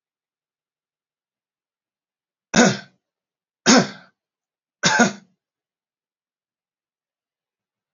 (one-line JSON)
{"three_cough_length": "7.9 s", "three_cough_amplitude": 30007, "three_cough_signal_mean_std_ratio": 0.22, "survey_phase": "alpha (2021-03-01 to 2021-08-12)", "age": "18-44", "gender": "Male", "wearing_mask": "No", "symptom_none": true, "smoker_status": "Never smoked", "respiratory_condition_asthma": false, "respiratory_condition_other": false, "recruitment_source": "REACT", "submission_delay": "1 day", "covid_test_result": "Negative", "covid_test_method": "RT-qPCR"}